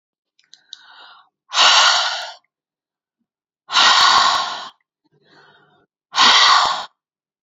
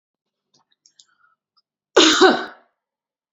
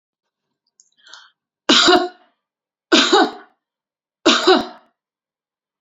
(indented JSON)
{
  "exhalation_length": "7.4 s",
  "exhalation_amplitude": 31795,
  "exhalation_signal_mean_std_ratio": 0.45,
  "cough_length": "3.3 s",
  "cough_amplitude": 30263,
  "cough_signal_mean_std_ratio": 0.29,
  "three_cough_length": "5.8 s",
  "three_cough_amplitude": 31464,
  "three_cough_signal_mean_std_ratio": 0.35,
  "survey_phase": "beta (2021-08-13 to 2022-03-07)",
  "age": "45-64",
  "gender": "Female",
  "wearing_mask": "No",
  "symptom_none": true,
  "smoker_status": "Never smoked",
  "respiratory_condition_asthma": false,
  "respiratory_condition_other": false,
  "recruitment_source": "REACT",
  "submission_delay": "2 days",
  "covid_test_result": "Negative",
  "covid_test_method": "RT-qPCR",
  "influenza_a_test_result": "Negative",
  "influenza_b_test_result": "Negative"
}